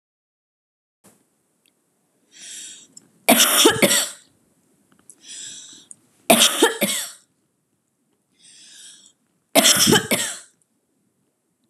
{"three_cough_length": "11.7 s", "three_cough_amplitude": 32768, "three_cough_signal_mean_std_ratio": 0.34, "survey_phase": "beta (2021-08-13 to 2022-03-07)", "age": "18-44", "gender": "Female", "wearing_mask": "No", "symptom_none": true, "symptom_onset": "7 days", "smoker_status": "Never smoked", "respiratory_condition_asthma": false, "respiratory_condition_other": false, "recruitment_source": "Test and Trace", "submission_delay": "2 days", "covid_test_result": "Positive", "covid_test_method": "RT-qPCR", "covid_ct_value": 28.1, "covid_ct_gene": "ORF1ab gene", "covid_ct_mean": 29.3, "covid_viral_load": "240 copies/ml", "covid_viral_load_category": "Minimal viral load (< 10K copies/ml)"}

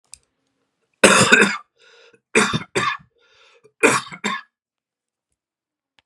{"three_cough_length": "6.1 s", "three_cough_amplitude": 32768, "three_cough_signal_mean_std_ratio": 0.34, "survey_phase": "beta (2021-08-13 to 2022-03-07)", "age": "45-64", "gender": "Male", "wearing_mask": "No", "symptom_cough_any": true, "symptom_runny_or_blocked_nose": true, "symptom_sore_throat": true, "symptom_fatigue": true, "symptom_change_to_sense_of_smell_or_taste": true, "symptom_loss_of_taste": true, "symptom_onset": "2 days", "smoker_status": "Never smoked", "respiratory_condition_asthma": false, "respiratory_condition_other": false, "recruitment_source": "Test and Trace", "submission_delay": "2 days", "covid_test_result": "Positive", "covid_test_method": "LAMP"}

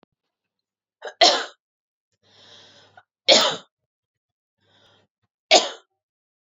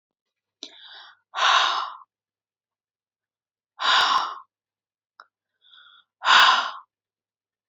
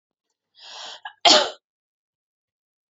{"three_cough_length": "6.5 s", "three_cough_amplitude": 32213, "three_cough_signal_mean_std_ratio": 0.24, "exhalation_length": "7.7 s", "exhalation_amplitude": 23143, "exhalation_signal_mean_std_ratio": 0.34, "cough_length": "2.9 s", "cough_amplitude": 32005, "cough_signal_mean_std_ratio": 0.24, "survey_phase": "beta (2021-08-13 to 2022-03-07)", "age": "18-44", "gender": "Female", "wearing_mask": "No", "symptom_none": true, "smoker_status": "Ex-smoker", "respiratory_condition_asthma": false, "respiratory_condition_other": false, "recruitment_source": "REACT", "submission_delay": "1 day", "covid_test_result": "Negative", "covid_test_method": "RT-qPCR", "influenza_a_test_result": "Negative", "influenza_b_test_result": "Negative"}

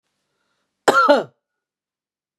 {"cough_length": "2.4 s", "cough_amplitude": 31847, "cough_signal_mean_std_ratio": 0.3, "survey_phase": "beta (2021-08-13 to 2022-03-07)", "age": "45-64", "gender": "Female", "wearing_mask": "No", "symptom_none": true, "smoker_status": "Ex-smoker", "respiratory_condition_asthma": true, "respiratory_condition_other": false, "recruitment_source": "REACT", "submission_delay": "1 day", "covid_test_result": "Negative", "covid_test_method": "RT-qPCR", "influenza_a_test_result": "Negative", "influenza_b_test_result": "Negative"}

